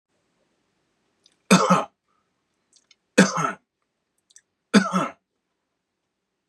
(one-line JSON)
{"three_cough_length": "6.5 s", "three_cough_amplitude": 31536, "three_cough_signal_mean_std_ratio": 0.27, "survey_phase": "beta (2021-08-13 to 2022-03-07)", "age": "45-64", "gender": "Male", "wearing_mask": "No", "symptom_none": true, "smoker_status": "Never smoked", "respiratory_condition_asthma": false, "respiratory_condition_other": false, "recruitment_source": "REACT", "submission_delay": "1 day", "covid_test_result": "Negative", "covid_test_method": "RT-qPCR", "influenza_a_test_result": "Negative", "influenza_b_test_result": "Negative"}